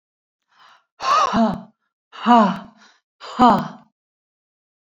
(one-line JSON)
{"exhalation_length": "4.9 s", "exhalation_amplitude": 30901, "exhalation_signal_mean_std_ratio": 0.39, "survey_phase": "beta (2021-08-13 to 2022-03-07)", "age": "45-64", "gender": "Female", "wearing_mask": "No", "symptom_none": true, "smoker_status": "Never smoked", "respiratory_condition_asthma": false, "respiratory_condition_other": false, "recruitment_source": "REACT", "submission_delay": "5 days", "covid_test_result": "Negative", "covid_test_method": "RT-qPCR"}